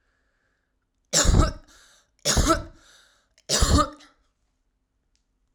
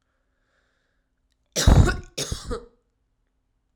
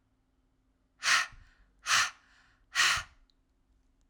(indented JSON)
{
  "three_cough_length": "5.5 s",
  "three_cough_amplitude": 17471,
  "three_cough_signal_mean_std_ratio": 0.36,
  "cough_length": "3.8 s",
  "cough_amplitude": 28632,
  "cough_signal_mean_std_ratio": 0.28,
  "exhalation_length": "4.1 s",
  "exhalation_amplitude": 9509,
  "exhalation_signal_mean_std_ratio": 0.35,
  "survey_phase": "alpha (2021-03-01 to 2021-08-12)",
  "age": "18-44",
  "gender": "Female",
  "wearing_mask": "No",
  "symptom_diarrhoea": true,
  "symptom_fatigue": true,
  "symptom_fever_high_temperature": true,
  "symptom_headache": true,
  "symptom_onset": "3 days",
  "smoker_status": "Never smoked",
  "respiratory_condition_asthma": true,
  "respiratory_condition_other": false,
  "recruitment_source": "Test and Trace",
  "submission_delay": "1 day",
  "covid_test_result": "Positive",
  "covid_test_method": "RT-qPCR"
}